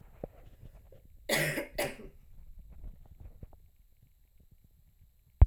{
  "cough_length": "5.5 s",
  "cough_amplitude": 15476,
  "cough_signal_mean_std_ratio": 0.25,
  "survey_phase": "alpha (2021-03-01 to 2021-08-12)",
  "age": "18-44",
  "gender": "Female",
  "wearing_mask": "No",
  "symptom_cough_any": true,
  "symptom_fatigue": true,
  "symptom_fever_high_temperature": true,
  "symptom_headache": true,
  "smoker_status": "Never smoked",
  "respiratory_condition_asthma": true,
  "respiratory_condition_other": false,
  "recruitment_source": "Test and Trace",
  "submission_delay": "1 day",
  "covid_test_result": "Positive",
  "covid_test_method": "RT-qPCR"
}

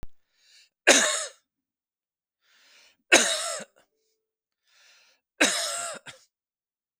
{
  "three_cough_length": "7.0 s",
  "three_cough_amplitude": 29527,
  "three_cough_signal_mean_std_ratio": 0.3,
  "survey_phase": "beta (2021-08-13 to 2022-03-07)",
  "age": "18-44",
  "gender": "Male",
  "wearing_mask": "No",
  "symptom_none": true,
  "smoker_status": "Current smoker (e-cigarettes or vapes only)",
  "respiratory_condition_asthma": false,
  "respiratory_condition_other": false,
  "recruitment_source": "REACT",
  "submission_delay": "2 days",
  "covid_test_result": "Negative",
  "covid_test_method": "RT-qPCR"
}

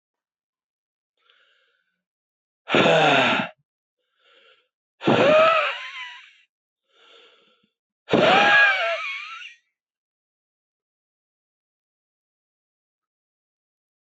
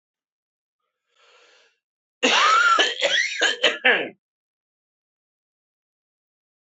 {
  "exhalation_length": "14.2 s",
  "exhalation_amplitude": 21231,
  "exhalation_signal_mean_std_ratio": 0.35,
  "cough_length": "6.7 s",
  "cough_amplitude": 24274,
  "cough_signal_mean_std_ratio": 0.4,
  "survey_phase": "beta (2021-08-13 to 2022-03-07)",
  "age": "45-64",
  "gender": "Male",
  "wearing_mask": "No",
  "symptom_cough_any": true,
  "symptom_runny_or_blocked_nose": true,
  "symptom_onset": "2 days",
  "smoker_status": "Never smoked",
  "respiratory_condition_asthma": false,
  "respiratory_condition_other": false,
  "recruitment_source": "Test and Trace",
  "submission_delay": "2 days",
  "covid_test_result": "Positive",
  "covid_test_method": "RT-qPCR",
  "covid_ct_value": 12.7,
  "covid_ct_gene": "ORF1ab gene",
  "covid_ct_mean": 13.3,
  "covid_viral_load": "44000000 copies/ml",
  "covid_viral_load_category": "High viral load (>1M copies/ml)"
}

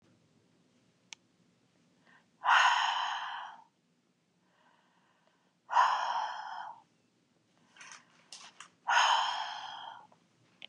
{
  "exhalation_length": "10.7 s",
  "exhalation_amplitude": 8667,
  "exhalation_signal_mean_std_ratio": 0.38,
  "survey_phase": "beta (2021-08-13 to 2022-03-07)",
  "age": "65+",
  "gender": "Female",
  "wearing_mask": "No",
  "symptom_headache": true,
  "symptom_onset": "6 days",
  "smoker_status": "Current smoker (e-cigarettes or vapes only)",
  "respiratory_condition_asthma": false,
  "respiratory_condition_other": false,
  "recruitment_source": "Test and Trace",
  "submission_delay": "3 days",
  "covid_test_result": "Negative",
  "covid_test_method": "RT-qPCR"
}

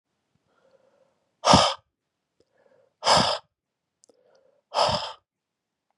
{
  "exhalation_length": "6.0 s",
  "exhalation_amplitude": 28121,
  "exhalation_signal_mean_std_ratio": 0.29,
  "survey_phase": "beta (2021-08-13 to 2022-03-07)",
  "age": "45-64",
  "gender": "Male",
  "wearing_mask": "No",
  "symptom_cough_any": true,
  "symptom_headache": true,
  "symptom_onset": "4 days",
  "smoker_status": "Never smoked",
  "respiratory_condition_asthma": false,
  "respiratory_condition_other": false,
  "recruitment_source": "Test and Trace",
  "submission_delay": "1 day",
  "covid_test_result": "Positive",
  "covid_test_method": "RT-qPCR",
  "covid_ct_value": 18.3,
  "covid_ct_gene": "N gene"
}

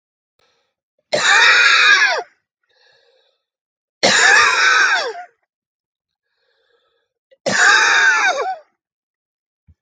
{
  "three_cough_length": "9.8 s",
  "three_cough_amplitude": 29734,
  "three_cough_signal_mean_std_ratio": 0.5,
  "survey_phase": "alpha (2021-03-01 to 2021-08-12)",
  "age": "45-64",
  "gender": "Male",
  "wearing_mask": "No",
  "symptom_none": true,
  "smoker_status": "Ex-smoker",
  "respiratory_condition_asthma": false,
  "respiratory_condition_other": false,
  "recruitment_source": "REACT",
  "submission_delay": "2 days",
  "covid_test_result": "Negative",
  "covid_test_method": "RT-qPCR"
}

